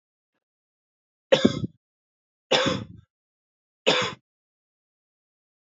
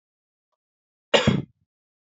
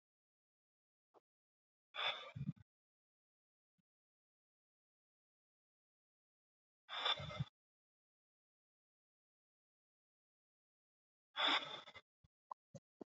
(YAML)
three_cough_length: 5.7 s
three_cough_amplitude: 24783
three_cough_signal_mean_std_ratio: 0.27
cough_length: 2.0 s
cough_amplitude: 24825
cough_signal_mean_std_ratio: 0.26
exhalation_length: 13.1 s
exhalation_amplitude: 2350
exhalation_signal_mean_std_ratio: 0.23
survey_phase: beta (2021-08-13 to 2022-03-07)
age: 18-44
gender: Male
wearing_mask: 'No'
symptom_cough_any: true
symptom_new_continuous_cough: true
symptom_runny_or_blocked_nose: true
symptom_shortness_of_breath: true
symptom_sore_throat: true
symptom_diarrhoea: true
symptom_fatigue: true
symptom_fever_high_temperature: true
symptom_headache: true
symptom_onset: 4 days
smoker_status: Current smoker (e-cigarettes or vapes only)
respiratory_condition_asthma: false
respiratory_condition_other: false
recruitment_source: Test and Trace
submission_delay: 1 day
covid_test_result: Positive
covid_test_method: RT-qPCR
covid_ct_value: 20.8
covid_ct_gene: ORF1ab gene